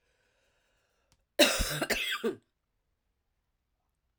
{"cough_length": "4.2 s", "cough_amplitude": 13033, "cough_signal_mean_std_ratio": 0.32, "survey_phase": "alpha (2021-03-01 to 2021-08-12)", "age": "45-64", "gender": "Female", "wearing_mask": "No", "symptom_cough_any": true, "symptom_shortness_of_breath": true, "symptom_fatigue": true, "symptom_fever_high_temperature": true, "symptom_onset": "3 days", "smoker_status": "Never smoked", "respiratory_condition_asthma": false, "respiratory_condition_other": false, "recruitment_source": "Test and Trace", "submission_delay": "2 days", "covid_test_result": "Positive", "covid_test_method": "RT-qPCR", "covid_ct_value": 15.3, "covid_ct_gene": "ORF1ab gene", "covid_ct_mean": 15.7, "covid_viral_load": "7000000 copies/ml", "covid_viral_load_category": "High viral load (>1M copies/ml)"}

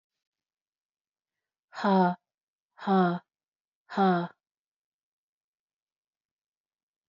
{"exhalation_length": "7.1 s", "exhalation_amplitude": 8222, "exhalation_signal_mean_std_ratio": 0.29, "survey_phase": "beta (2021-08-13 to 2022-03-07)", "age": "18-44", "gender": "Female", "wearing_mask": "No", "symptom_cough_any": true, "symptom_new_continuous_cough": true, "symptom_sore_throat": true, "symptom_fatigue": true, "symptom_headache": true, "symptom_onset": "3 days", "smoker_status": "Never smoked", "respiratory_condition_asthma": false, "respiratory_condition_other": false, "recruitment_source": "Test and Trace", "submission_delay": "1 day", "covid_test_result": "Positive", "covid_test_method": "ePCR"}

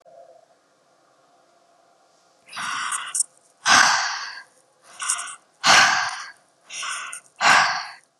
{"exhalation_length": "8.2 s", "exhalation_amplitude": 30239, "exhalation_signal_mean_std_ratio": 0.42, "survey_phase": "beta (2021-08-13 to 2022-03-07)", "age": "18-44", "gender": "Female", "wearing_mask": "No", "symptom_none": true, "smoker_status": "Never smoked", "respiratory_condition_asthma": false, "respiratory_condition_other": false, "recruitment_source": "REACT", "submission_delay": "2 days", "covid_test_result": "Negative", "covid_test_method": "RT-qPCR", "influenza_a_test_result": "Negative", "influenza_b_test_result": "Negative"}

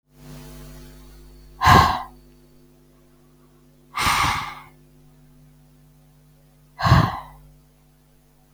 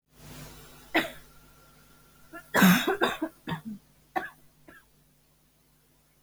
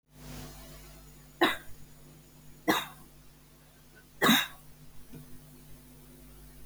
{"exhalation_length": "8.5 s", "exhalation_amplitude": 32767, "exhalation_signal_mean_std_ratio": 0.32, "cough_length": "6.2 s", "cough_amplitude": 15743, "cough_signal_mean_std_ratio": 0.33, "three_cough_length": "6.7 s", "three_cough_amplitude": 12083, "three_cough_signal_mean_std_ratio": 0.35, "survey_phase": "beta (2021-08-13 to 2022-03-07)", "age": "18-44", "gender": "Female", "wearing_mask": "No", "symptom_cough_any": true, "symptom_runny_or_blocked_nose": true, "symptom_sore_throat": true, "symptom_fatigue": true, "symptom_headache": true, "smoker_status": "Never smoked", "respiratory_condition_asthma": false, "respiratory_condition_other": false, "recruitment_source": "Test and Trace", "submission_delay": "2 days", "covid_test_result": "Positive", "covid_test_method": "RT-qPCR", "covid_ct_value": 23.5, "covid_ct_gene": "ORF1ab gene", "covid_ct_mean": 23.7, "covid_viral_load": "17000 copies/ml", "covid_viral_load_category": "Low viral load (10K-1M copies/ml)"}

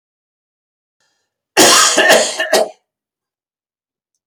{"cough_length": "4.3 s", "cough_amplitude": 32768, "cough_signal_mean_std_ratio": 0.4, "survey_phase": "beta (2021-08-13 to 2022-03-07)", "age": "65+", "gender": "Male", "wearing_mask": "No", "symptom_none": true, "smoker_status": "Never smoked", "respiratory_condition_asthma": false, "respiratory_condition_other": false, "recruitment_source": "REACT", "submission_delay": "2 days", "covid_test_result": "Negative", "covid_test_method": "RT-qPCR", "influenza_a_test_result": "Negative", "influenza_b_test_result": "Negative"}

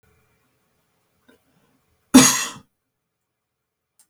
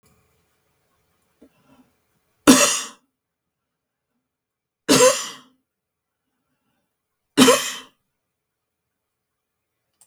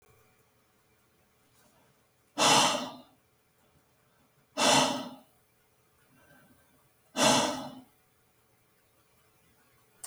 {"cough_length": "4.1 s", "cough_amplitude": 32768, "cough_signal_mean_std_ratio": 0.19, "three_cough_length": "10.1 s", "three_cough_amplitude": 32768, "three_cough_signal_mean_std_ratio": 0.23, "exhalation_length": "10.1 s", "exhalation_amplitude": 11590, "exhalation_signal_mean_std_ratio": 0.3, "survey_phase": "beta (2021-08-13 to 2022-03-07)", "age": "65+", "gender": "Male", "wearing_mask": "No", "symptom_none": true, "smoker_status": "Never smoked", "respiratory_condition_asthma": false, "respiratory_condition_other": false, "recruitment_source": "REACT", "submission_delay": "2 days", "covid_test_result": "Negative", "covid_test_method": "RT-qPCR", "influenza_a_test_result": "Negative", "influenza_b_test_result": "Negative"}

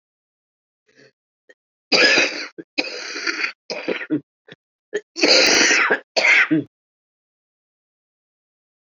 {"cough_length": "8.9 s", "cough_amplitude": 27825, "cough_signal_mean_std_ratio": 0.42, "survey_phase": "beta (2021-08-13 to 2022-03-07)", "age": "45-64", "gender": "Female", "wearing_mask": "No", "symptom_cough_any": true, "symptom_runny_or_blocked_nose": true, "symptom_shortness_of_breath": true, "symptom_sore_throat": true, "symptom_diarrhoea": true, "symptom_fatigue": true, "symptom_headache": true, "symptom_change_to_sense_of_smell_or_taste": true, "symptom_loss_of_taste": true, "symptom_onset": "8 days", "smoker_status": "Ex-smoker", "respiratory_condition_asthma": true, "respiratory_condition_other": false, "recruitment_source": "Test and Trace", "submission_delay": "2 days", "covid_test_result": "Positive", "covid_test_method": "RT-qPCR"}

